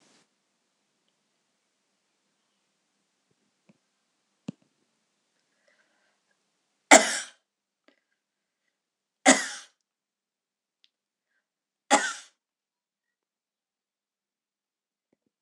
{
  "cough_length": "15.4 s",
  "cough_amplitude": 26028,
  "cough_signal_mean_std_ratio": 0.13,
  "survey_phase": "alpha (2021-03-01 to 2021-08-12)",
  "age": "65+",
  "gender": "Female",
  "wearing_mask": "No",
  "symptom_none": true,
  "smoker_status": "Never smoked",
  "respiratory_condition_asthma": false,
  "respiratory_condition_other": false,
  "recruitment_source": "REACT",
  "submission_delay": "1 day",
  "covid_test_result": "Negative",
  "covid_test_method": "RT-qPCR"
}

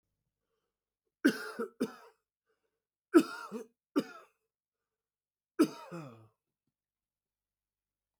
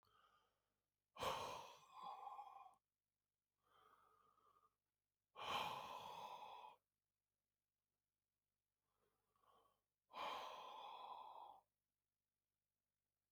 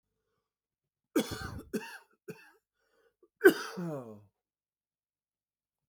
{
  "three_cough_length": "8.2 s",
  "three_cough_amplitude": 10100,
  "three_cough_signal_mean_std_ratio": 0.21,
  "exhalation_length": "13.3 s",
  "exhalation_amplitude": 707,
  "exhalation_signal_mean_std_ratio": 0.43,
  "cough_length": "5.9 s",
  "cough_amplitude": 14650,
  "cough_signal_mean_std_ratio": 0.22,
  "survey_phase": "beta (2021-08-13 to 2022-03-07)",
  "age": "65+",
  "gender": "Male",
  "wearing_mask": "No",
  "symptom_cough_any": true,
  "symptom_sore_throat": true,
  "symptom_diarrhoea": true,
  "symptom_fever_high_temperature": true,
  "symptom_headache": true,
  "symptom_change_to_sense_of_smell_or_taste": true,
  "symptom_loss_of_taste": true,
  "smoker_status": "Ex-smoker",
  "respiratory_condition_asthma": false,
  "respiratory_condition_other": false,
  "recruitment_source": "Test and Trace",
  "submission_delay": "2 days",
  "covid_test_result": "Positive",
  "covid_test_method": "LFT"
}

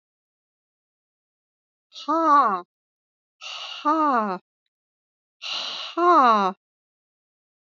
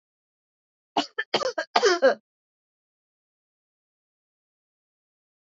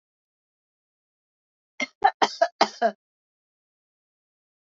{
  "exhalation_length": "7.8 s",
  "exhalation_amplitude": 17385,
  "exhalation_signal_mean_std_ratio": 0.39,
  "cough_length": "5.5 s",
  "cough_amplitude": 26786,
  "cough_signal_mean_std_ratio": 0.25,
  "three_cough_length": "4.7 s",
  "three_cough_amplitude": 21895,
  "three_cough_signal_mean_std_ratio": 0.21,
  "survey_phase": "alpha (2021-03-01 to 2021-08-12)",
  "age": "65+",
  "gender": "Female",
  "wearing_mask": "No",
  "symptom_none": true,
  "smoker_status": "Never smoked",
  "respiratory_condition_asthma": false,
  "respiratory_condition_other": false,
  "recruitment_source": "REACT",
  "submission_delay": "0 days",
  "covid_test_result": "Negative",
  "covid_test_method": "RT-qPCR"
}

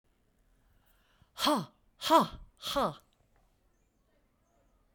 {
  "exhalation_length": "4.9 s",
  "exhalation_amplitude": 10848,
  "exhalation_signal_mean_std_ratio": 0.29,
  "survey_phase": "beta (2021-08-13 to 2022-03-07)",
  "age": "45-64",
  "gender": "Female",
  "wearing_mask": "No",
  "symptom_cough_any": true,
  "symptom_onset": "2 days",
  "smoker_status": "Never smoked",
  "respiratory_condition_asthma": false,
  "respiratory_condition_other": false,
  "recruitment_source": "Test and Trace",
  "submission_delay": "1 day",
  "covid_test_result": "Negative",
  "covid_test_method": "RT-qPCR"
}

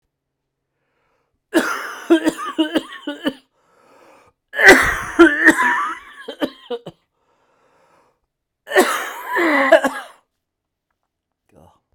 {
  "three_cough_length": "11.9 s",
  "three_cough_amplitude": 32768,
  "three_cough_signal_mean_std_ratio": 0.38,
  "survey_phase": "beta (2021-08-13 to 2022-03-07)",
  "age": "45-64",
  "gender": "Male",
  "wearing_mask": "No",
  "symptom_cough_any": true,
  "symptom_runny_or_blocked_nose": true,
  "symptom_shortness_of_breath": true,
  "symptom_sore_throat": true,
  "symptom_fatigue": true,
  "symptom_fever_high_temperature": true,
  "symptom_headache": true,
  "symptom_change_to_sense_of_smell_or_taste": true,
  "symptom_loss_of_taste": true,
  "smoker_status": "Never smoked",
  "respiratory_condition_asthma": false,
  "respiratory_condition_other": false,
  "recruitment_source": "Test and Trace",
  "submission_delay": "1 day",
  "covid_test_result": "Positive",
  "covid_test_method": "RT-qPCR",
  "covid_ct_value": 28.7,
  "covid_ct_gene": "ORF1ab gene"
}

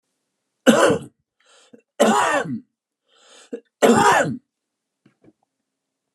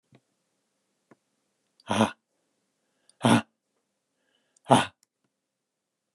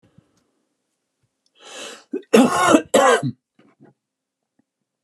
{
  "three_cough_length": "6.1 s",
  "three_cough_amplitude": 32364,
  "three_cough_signal_mean_std_ratio": 0.38,
  "exhalation_length": "6.1 s",
  "exhalation_amplitude": 24998,
  "exhalation_signal_mean_std_ratio": 0.21,
  "cough_length": "5.0 s",
  "cough_amplitude": 32738,
  "cough_signal_mean_std_ratio": 0.33,
  "survey_phase": "alpha (2021-03-01 to 2021-08-12)",
  "age": "45-64",
  "gender": "Male",
  "wearing_mask": "No",
  "symptom_none": true,
  "smoker_status": "Never smoked",
  "respiratory_condition_asthma": false,
  "respiratory_condition_other": false,
  "recruitment_source": "REACT",
  "submission_delay": "3 days",
  "covid_test_result": "Negative",
  "covid_test_method": "RT-qPCR"
}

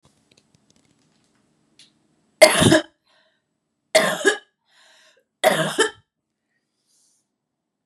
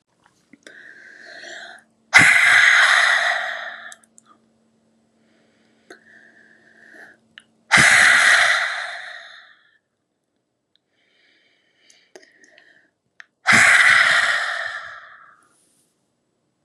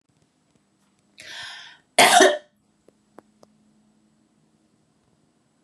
{
  "three_cough_length": "7.9 s",
  "three_cough_amplitude": 32768,
  "three_cough_signal_mean_std_ratio": 0.27,
  "exhalation_length": "16.6 s",
  "exhalation_amplitude": 32768,
  "exhalation_signal_mean_std_ratio": 0.4,
  "cough_length": "5.6 s",
  "cough_amplitude": 28601,
  "cough_signal_mean_std_ratio": 0.23,
  "survey_phase": "beta (2021-08-13 to 2022-03-07)",
  "age": "45-64",
  "gender": "Female",
  "wearing_mask": "No",
  "symptom_none": true,
  "smoker_status": "Never smoked",
  "respiratory_condition_asthma": false,
  "respiratory_condition_other": false,
  "recruitment_source": "REACT",
  "submission_delay": "2 days",
  "covid_test_result": "Negative",
  "covid_test_method": "RT-qPCR",
  "influenza_a_test_result": "Negative",
  "influenza_b_test_result": "Negative"
}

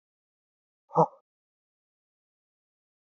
{
  "exhalation_length": "3.1 s",
  "exhalation_amplitude": 13153,
  "exhalation_signal_mean_std_ratio": 0.14,
  "survey_phase": "beta (2021-08-13 to 2022-03-07)",
  "age": "18-44",
  "gender": "Male",
  "wearing_mask": "No",
  "symptom_none": true,
  "smoker_status": "Never smoked",
  "respiratory_condition_asthma": true,
  "respiratory_condition_other": false,
  "recruitment_source": "Test and Trace",
  "submission_delay": "-1 day",
  "covid_test_result": "Negative",
  "covid_test_method": "LFT"
}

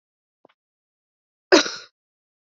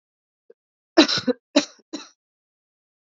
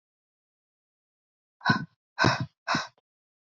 {
  "cough_length": "2.5 s",
  "cough_amplitude": 27432,
  "cough_signal_mean_std_ratio": 0.18,
  "three_cough_length": "3.1 s",
  "three_cough_amplitude": 28367,
  "three_cough_signal_mean_std_ratio": 0.24,
  "exhalation_length": "3.5 s",
  "exhalation_amplitude": 13166,
  "exhalation_signal_mean_std_ratio": 0.3,
  "survey_phase": "beta (2021-08-13 to 2022-03-07)",
  "age": "18-44",
  "gender": "Female",
  "wearing_mask": "No",
  "symptom_cough_any": true,
  "symptom_runny_or_blocked_nose": true,
  "symptom_shortness_of_breath": true,
  "symptom_sore_throat": true,
  "symptom_abdominal_pain": true,
  "symptom_fatigue": true,
  "symptom_headache": true,
  "symptom_change_to_sense_of_smell_or_taste": true,
  "symptom_onset": "2 days",
  "smoker_status": "Current smoker (e-cigarettes or vapes only)",
  "respiratory_condition_asthma": true,
  "respiratory_condition_other": false,
  "recruitment_source": "Test and Trace",
  "submission_delay": "1 day",
  "covid_test_result": "Positive",
  "covid_test_method": "RT-qPCR",
  "covid_ct_value": 16.8,
  "covid_ct_gene": "N gene"
}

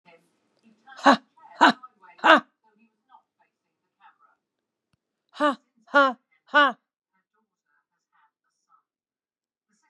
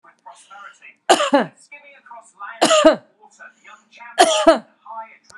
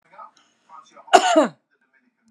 {
  "exhalation_length": "9.9 s",
  "exhalation_amplitude": 32578,
  "exhalation_signal_mean_std_ratio": 0.22,
  "three_cough_length": "5.4 s",
  "three_cough_amplitude": 32767,
  "three_cough_signal_mean_std_ratio": 0.37,
  "cough_length": "2.3 s",
  "cough_amplitude": 32768,
  "cough_signal_mean_std_ratio": 0.29,
  "survey_phase": "beta (2021-08-13 to 2022-03-07)",
  "age": "65+",
  "gender": "Female",
  "wearing_mask": "No",
  "symptom_none": true,
  "smoker_status": "Ex-smoker",
  "respiratory_condition_asthma": false,
  "respiratory_condition_other": false,
  "recruitment_source": "REACT",
  "submission_delay": "1 day",
  "covid_test_result": "Negative",
  "covid_test_method": "RT-qPCR"
}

